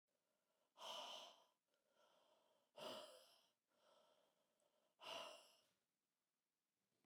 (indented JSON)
{
  "exhalation_length": "7.1 s",
  "exhalation_amplitude": 283,
  "exhalation_signal_mean_std_ratio": 0.41,
  "survey_phase": "beta (2021-08-13 to 2022-03-07)",
  "age": "45-64",
  "gender": "Female",
  "wearing_mask": "No",
  "symptom_cough_any": true,
  "symptom_runny_or_blocked_nose": true,
  "symptom_sore_throat": true,
  "symptom_fatigue": true,
  "symptom_other": true,
  "smoker_status": "Never smoked",
  "respiratory_condition_asthma": true,
  "respiratory_condition_other": false,
  "recruitment_source": "Test and Trace",
  "submission_delay": "2 days",
  "covid_test_result": "Positive",
  "covid_test_method": "RT-qPCR",
  "covid_ct_value": 21.4,
  "covid_ct_gene": "N gene"
}